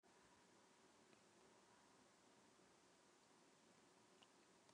cough_length: 4.7 s
cough_amplitude: 82
cough_signal_mean_std_ratio: 1.18
survey_phase: beta (2021-08-13 to 2022-03-07)
age: 65+
gender: Male
wearing_mask: 'No'
symptom_shortness_of_breath: true
symptom_fatigue: true
symptom_headache: true
symptom_onset: 12 days
smoker_status: Ex-smoker
respiratory_condition_asthma: false
respiratory_condition_other: false
recruitment_source: REACT
submission_delay: 1 day
covid_test_result: Negative
covid_test_method: RT-qPCR
influenza_a_test_result: Negative
influenza_b_test_result: Negative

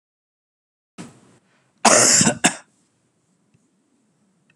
cough_length: 4.6 s
cough_amplitude: 32761
cough_signal_mean_std_ratio: 0.29
survey_phase: beta (2021-08-13 to 2022-03-07)
age: 45-64
gender: Male
wearing_mask: 'No'
symptom_none: true
smoker_status: Never smoked
respiratory_condition_asthma: false
respiratory_condition_other: false
recruitment_source: REACT
submission_delay: 2 days
covid_test_result: Negative
covid_test_method: RT-qPCR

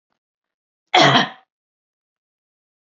cough_length: 3.0 s
cough_amplitude: 31252
cough_signal_mean_std_ratio: 0.26
survey_phase: beta (2021-08-13 to 2022-03-07)
age: 65+
gender: Female
wearing_mask: 'No'
symptom_runny_or_blocked_nose: true
symptom_sore_throat: true
symptom_onset: 10 days
smoker_status: Never smoked
respiratory_condition_asthma: false
respiratory_condition_other: false
recruitment_source: REACT
submission_delay: 1 day
covid_test_result: Negative
covid_test_method: RT-qPCR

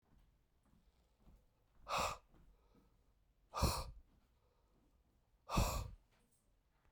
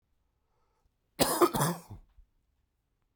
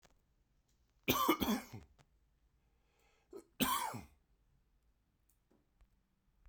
exhalation_length: 6.9 s
exhalation_amplitude: 2322
exhalation_signal_mean_std_ratio: 0.32
cough_length: 3.2 s
cough_amplitude: 12455
cough_signal_mean_std_ratio: 0.31
three_cough_length: 6.5 s
three_cough_amplitude: 5478
three_cough_signal_mean_std_ratio: 0.31
survey_phase: beta (2021-08-13 to 2022-03-07)
age: 45-64
gender: Male
wearing_mask: 'No'
symptom_cough_any: true
symptom_runny_or_blocked_nose: true
symptom_sore_throat: true
symptom_fever_high_temperature: true
symptom_headache: true
symptom_onset: 3 days
smoker_status: Never smoked
respiratory_condition_asthma: false
respiratory_condition_other: false
recruitment_source: Test and Trace
submission_delay: 2 days
covid_test_method: PCR
covid_ct_value: 35.7
covid_ct_gene: ORF1ab gene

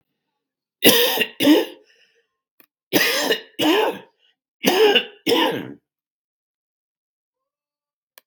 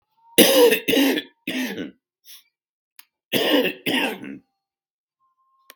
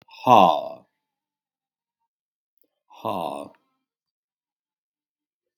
three_cough_length: 8.3 s
three_cough_amplitude: 32768
three_cough_signal_mean_std_ratio: 0.42
cough_length: 5.8 s
cough_amplitude: 32768
cough_signal_mean_std_ratio: 0.43
exhalation_length: 5.6 s
exhalation_amplitude: 31858
exhalation_signal_mean_std_ratio: 0.22
survey_phase: beta (2021-08-13 to 2022-03-07)
age: 65+
gender: Male
wearing_mask: 'No'
symptom_cough_any: true
symptom_runny_or_blocked_nose: true
symptom_shortness_of_breath: true
symptom_sore_throat: true
symptom_fatigue: true
symptom_fever_high_temperature: true
symptom_headache: true
symptom_change_to_sense_of_smell_or_taste: true
symptom_loss_of_taste: true
symptom_onset: 3 days
smoker_status: Never smoked
respiratory_condition_asthma: false
respiratory_condition_other: false
recruitment_source: Test and Trace
submission_delay: 1 day
covid_test_result: Positive
covid_test_method: ePCR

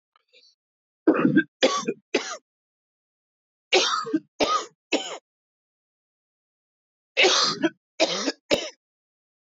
three_cough_length: 9.5 s
three_cough_amplitude: 17112
three_cough_signal_mean_std_ratio: 0.39
survey_phase: beta (2021-08-13 to 2022-03-07)
age: 45-64
gender: Male
wearing_mask: 'No'
symptom_cough_any: true
symptom_new_continuous_cough: true
symptom_runny_or_blocked_nose: true
symptom_shortness_of_breath: true
symptom_sore_throat: true
symptom_fatigue: true
symptom_fever_high_temperature: true
symptom_headache: true
symptom_change_to_sense_of_smell_or_taste: true
smoker_status: Ex-smoker
respiratory_condition_asthma: true
respiratory_condition_other: false
recruitment_source: Test and Trace
submission_delay: 2 days
covid_test_result: Positive
covid_test_method: RT-qPCR
covid_ct_value: 24.7
covid_ct_gene: ORF1ab gene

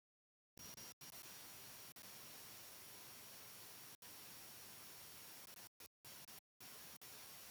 exhalation_length: 7.5 s
exhalation_amplitude: 266
exhalation_signal_mean_std_ratio: 1.01
survey_phase: beta (2021-08-13 to 2022-03-07)
age: 65+
gender: Male
wearing_mask: 'No'
symptom_none: true
smoker_status: Ex-smoker
respiratory_condition_asthma: false
respiratory_condition_other: false
recruitment_source: REACT
submission_delay: 2 days
covid_test_result: Negative
covid_test_method: RT-qPCR
influenza_a_test_result: Negative
influenza_b_test_result: Negative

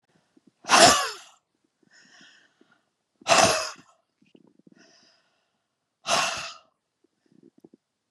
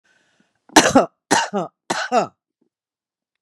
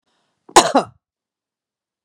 exhalation_length: 8.1 s
exhalation_amplitude: 28847
exhalation_signal_mean_std_ratio: 0.27
three_cough_length: 3.4 s
three_cough_amplitude: 32768
three_cough_signal_mean_std_ratio: 0.35
cough_length: 2.0 s
cough_amplitude: 32768
cough_signal_mean_std_ratio: 0.23
survey_phase: beta (2021-08-13 to 2022-03-07)
age: 65+
gender: Female
wearing_mask: 'No'
symptom_runny_or_blocked_nose: true
symptom_sore_throat: true
symptom_onset: 2 days
smoker_status: Never smoked
respiratory_condition_asthma: false
respiratory_condition_other: false
recruitment_source: Test and Trace
submission_delay: 1 day
covid_test_result: Negative
covid_test_method: ePCR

